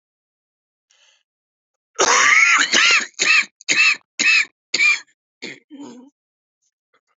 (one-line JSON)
{"cough_length": "7.2 s", "cough_amplitude": 26426, "cough_signal_mean_std_ratio": 0.46, "survey_phase": "beta (2021-08-13 to 2022-03-07)", "age": "45-64", "gender": "Male", "wearing_mask": "No", "symptom_cough_any": true, "symptom_new_continuous_cough": true, "symptom_runny_or_blocked_nose": true, "symptom_shortness_of_breath": true, "symptom_sore_throat": true, "symptom_abdominal_pain": true, "symptom_diarrhoea": true, "symptom_fatigue": true, "symptom_fever_high_temperature": true, "symptom_headache": true, "symptom_change_to_sense_of_smell_or_taste": true, "symptom_loss_of_taste": true, "symptom_other": true, "symptom_onset": "5 days", "smoker_status": "Ex-smoker", "respiratory_condition_asthma": false, "respiratory_condition_other": false, "recruitment_source": "REACT", "submission_delay": "2 days", "covid_test_result": "Positive", "covid_test_method": "RT-qPCR", "covid_ct_value": 22.0, "covid_ct_gene": "N gene", "influenza_a_test_result": "Negative", "influenza_b_test_result": "Negative"}